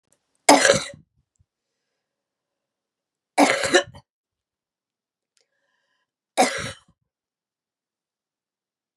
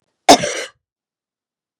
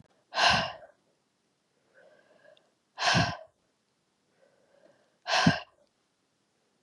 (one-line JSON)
{"three_cough_length": "9.0 s", "three_cough_amplitude": 32768, "three_cough_signal_mean_std_ratio": 0.24, "cough_length": "1.8 s", "cough_amplitude": 32768, "cough_signal_mean_std_ratio": 0.24, "exhalation_length": "6.8 s", "exhalation_amplitude": 11606, "exhalation_signal_mean_std_ratio": 0.31, "survey_phase": "beta (2021-08-13 to 2022-03-07)", "age": "45-64", "gender": "Female", "wearing_mask": "No", "symptom_cough_any": true, "symptom_shortness_of_breath": true, "symptom_loss_of_taste": true, "symptom_other": true, "symptom_onset": "6 days", "smoker_status": "Never smoked", "respiratory_condition_asthma": false, "respiratory_condition_other": false, "recruitment_source": "Test and Trace", "submission_delay": "2 days", "covid_test_result": "Positive", "covid_test_method": "RT-qPCR", "covid_ct_value": 16.5, "covid_ct_gene": "ORF1ab gene", "covid_ct_mean": 16.8, "covid_viral_load": "3000000 copies/ml", "covid_viral_load_category": "High viral load (>1M copies/ml)"}